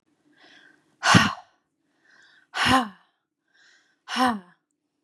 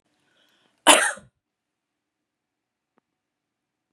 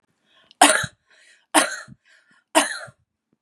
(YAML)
exhalation_length: 5.0 s
exhalation_amplitude: 26730
exhalation_signal_mean_std_ratio: 0.31
cough_length: 3.9 s
cough_amplitude: 32767
cough_signal_mean_std_ratio: 0.18
three_cough_length: 3.4 s
three_cough_amplitude: 32767
three_cough_signal_mean_std_ratio: 0.3
survey_phase: beta (2021-08-13 to 2022-03-07)
age: 18-44
gender: Female
wearing_mask: 'No'
symptom_none: true
smoker_status: Never smoked
respiratory_condition_asthma: false
respiratory_condition_other: false
recruitment_source: REACT
submission_delay: 2 days
covid_test_result: Negative
covid_test_method: RT-qPCR
influenza_a_test_result: Negative
influenza_b_test_result: Negative